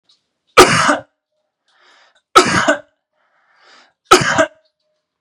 {"three_cough_length": "5.2 s", "three_cough_amplitude": 32768, "three_cough_signal_mean_std_ratio": 0.34, "survey_phase": "beta (2021-08-13 to 2022-03-07)", "age": "18-44", "gender": "Male", "wearing_mask": "No", "symptom_none": true, "smoker_status": "Never smoked", "respiratory_condition_asthma": false, "respiratory_condition_other": false, "recruitment_source": "REACT", "submission_delay": "1 day", "covid_test_result": "Negative", "covid_test_method": "RT-qPCR", "influenza_a_test_result": "Negative", "influenza_b_test_result": "Negative"}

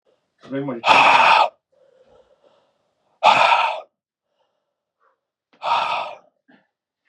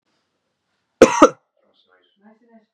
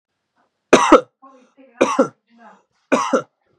{"exhalation_length": "7.1 s", "exhalation_amplitude": 32768, "exhalation_signal_mean_std_ratio": 0.39, "cough_length": "2.7 s", "cough_amplitude": 32768, "cough_signal_mean_std_ratio": 0.2, "three_cough_length": "3.6 s", "three_cough_amplitude": 32768, "three_cough_signal_mean_std_ratio": 0.33, "survey_phase": "beta (2021-08-13 to 2022-03-07)", "age": "18-44", "gender": "Male", "wearing_mask": "No", "symptom_cough_any": true, "symptom_runny_or_blocked_nose": true, "symptom_shortness_of_breath": true, "symptom_sore_throat": true, "symptom_abdominal_pain": true, "symptom_diarrhoea": true, "symptom_fatigue": true, "symptom_headache": true, "symptom_onset": "3 days", "smoker_status": "Never smoked", "respiratory_condition_asthma": false, "respiratory_condition_other": false, "recruitment_source": "Test and Trace", "submission_delay": "1 day", "covid_test_result": "Positive", "covid_test_method": "RT-qPCR", "covid_ct_value": 22.3, "covid_ct_gene": "ORF1ab gene"}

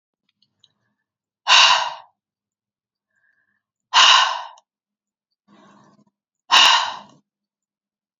{"exhalation_length": "8.2 s", "exhalation_amplitude": 32303, "exhalation_signal_mean_std_ratio": 0.31, "survey_phase": "beta (2021-08-13 to 2022-03-07)", "age": "18-44", "gender": "Female", "wearing_mask": "No", "symptom_none": true, "smoker_status": "Ex-smoker", "respiratory_condition_asthma": true, "respiratory_condition_other": false, "recruitment_source": "REACT", "submission_delay": "1 day", "covid_test_result": "Negative", "covid_test_method": "RT-qPCR", "influenza_a_test_result": "Negative", "influenza_b_test_result": "Negative"}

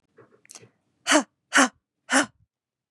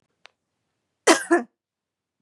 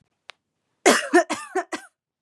{"exhalation_length": "2.9 s", "exhalation_amplitude": 25516, "exhalation_signal_mean_std_ratio": 0.3, "cough_length": "2.2 s", "cough_amplitude": 30613, "cough_signal_mean_std_ratio": 0.25, "three_cough_length": "2.2 s", "three_cough_amplitude": 29533, "three_cough_signal_mean_std_ratio": 0.35, "survey_phase": "beta (2021-08-13 to 2022-03-07)", "age": "18-44", "gender": "Female", "wearing_mask": "No", "symptom_none": true, "smoker_status": "Never smoked", "respiratory_condition_asthma": false, "respiratory_condition_other": false, "recruitment_source": "Test and Trace", "submission_delay": "2 days", "covid_test_result": "Negative", "covid_test_method": "RT-qPCR"}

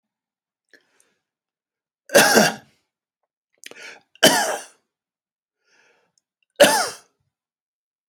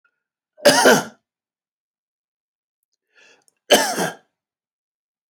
{"three_cough_length": "8.1 s", "three_cough_amplitude": 31659, "three_cough_signal_mean_std_ratio": 0.26, "cough_length": "5.3 s", "cough_amplitude": 30179, "cough_signal_mean_std_ratio": 0.28, "survey_phase": "alpha (2021-03-01 to 2021-08-12)", "age": "65+", "gender": "Male", "wearing_mask": "No", "symptom_none": true, "smoker_status": "Ex-smoker", "respiratory_condition_asthma": false, "respiratory_condition_other": false, "recruitment_source": "REACT", "submission_delay": "1 day", "covid_test_result": "Negative", "covid_test_method": "RT-qPCR"}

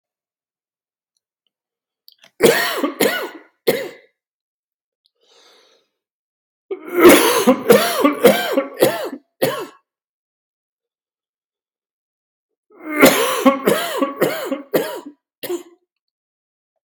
{"three_cough_length": "16.9 s", "three_cough_amplitude": 32768, "three_cough_signal_mean_std_ratio": 0.38, "survey_phase": "beta (2021-08-13 to 2022-03-07)", "age": "45-64", "gender": "Male", "wearing_mask": "No", "symptom_cough_any": true, "symptom_new_continuous_cough": true, "symptom_runny_or_blocked_nose": true, "symptom_fatigue": true, "symptom_fever_high_temperature": true, "symptom_headache": true, "symptom_change_to_sense_of_smell_or_taste": true, "symptom_loss_of_taste": true, "symptom_onset": "6 days", "smoker_status": "Never smoked", "respiratory_condition_asthma": false, "respiratory_condition_other": false, "recruitment_source": "Test and Trace", "submission_delay": "2 days", "covid_test_result": "Positive", "covid_test_method": "RT-qPCR", "covid_ct_value": 15.9, "covid_ct_gene": "S gene", "covid_ct_mean": 16.1, "covid_viral_load": "5200000 copies/ml", "covid_viral_load_category": "High viral load (>1M copies/ml)"}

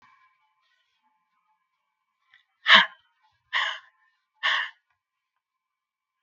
{"exhalation_length": "6.2 s", "exhalation_amplitude": 32768, "exhalation_signal_mean_std_ratio": 0.21, "survey_phase": "beta (2021-08-13 to 2022-03-07)", "age": "65+", "gender": "Female", "wearing_mask": "No", "symptom_none": true, "smoker_status": "Ex-smoker", "respiratory_condition_asthma": false, "respiratory_condition_other": false, "recruitment_source": "Test and Trace", "submission_delay": "1 day", "covid_test_result": "Negative", "covid_test_method": "RT-qPCR"}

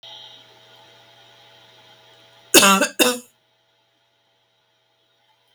{"cough_length": "5.5 s", "cough_amplitude": 32768, "cough_signal_mean_std_ratio": 0.25, "survey_phase": "beta (2021-08-13 to 2022-03-07)", "age": "65+", "gender": "Female", "wearing_mask": "No", "symptom_none": true, "smoker_status": "Ex-smoker", "respiratory_condition_asthma": false, "respiratory_condition_other": false, "recruitment_source": "REACT", "submission_delay": "2 days", "covid_test_result": "Negative", "covid_test_method": "RT-qPCR"}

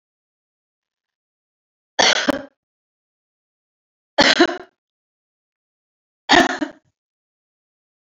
{"three_cough_length": "8.0 s", "three_cough_amplitude": 31388, "three_cough_signal_mean_std_ratio": 0.25, "survey_phase": "beta (2021-08-13 to 2022-03-07)", "age": "45-64", "gender": "Female", "wearing_mask": "No", "symptom_cough_any": true, "symptom_runny_or_blocked_nose": true, "symptom_sore_throat": true, "smoker_status": "Current smoker (1 to 10 cigarettes per day)", "respiratory_condition_asthma": false, "respiratory_condition_other": false, "recruitment_source": "Test and Trace", "submission_delay": "2 days", "covid_test_result": "Positive", "covid_test_method": "RT-qPCR", "covid_ct_value": 22.0, "covid_ct_gene": "ORF1ab gene", "covid_ct_mean": 22.5, "covid_viral_load": "41000 copies/ml", "covid_viral_load_category": "Low viral load (10K-1M copies/ml)"}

